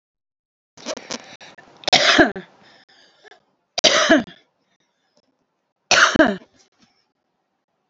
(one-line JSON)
{"three_cough_length": "7.9 s", "three_cough_amplitude": 32768, "three_cough_signal_mean_std_ratio": 0.32, "survey_phase": "alpha (2021-03-01 to 2021-08-12)", "age": "45-64", "gender": "Female", "wearing_mask": "No", "symptom_none": true, "symptom_onset": "12 days", "smoker_status": "Current smoker (11 or more cigarettes per day)", "respiratory_condition_asthma": false, "respiratory_condition_other": false, "recruitment_source": "REACT", "submission_delay": "1 day", "covid_test_result": "Negative", "covid_test_method": "RT-qPCR"}